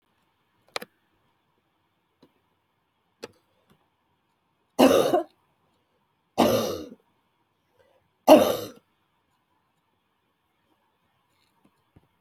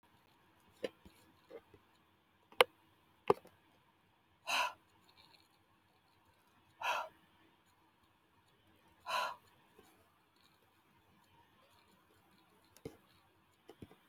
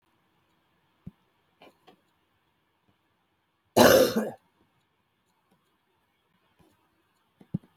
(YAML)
three_cough_length: 12.2 s
three_cough_amplitude: 28342
three_cough_signal_mean_std_ratio: 0.22
exhalation_length: 14.1 s
exhalation_amplitude: 15435
exhalation_signal_mean_std_ratio: 0.19
cough_length: 7.8 s
cough_amplitude: 21763
cough_signal_mean_std_ratio: 0.2
survey_phase: beta (2021-08-13 to 2022-03-07)
age: 65+
gender: Female
wearing_mask: 'No'
symptom_cough_any: true
symptom_fatigue: true
symptom_fever_high_temperature: true
symptom_headache: true
symptom_change_to_sense_of_smell_or_taste: true
symptom_loss_of_taste: true
symptom_onset: 5 days
smoker_status: Never smoked
respiratory_condition_asthma: false
respiratory_condition_other: false
recruitment_source: Test and Trace
submission_delay: 2 days
covid_test_result: Positive
covid_test_method: RT-qPCR
covid_ct_value: 14.6
covid_ct_gene: N gene
covid_ct_mean: 15.7
covid_viral_load: 7400000 copies/ml
covid_viral_load_category: High viral load (>1M copies/ml)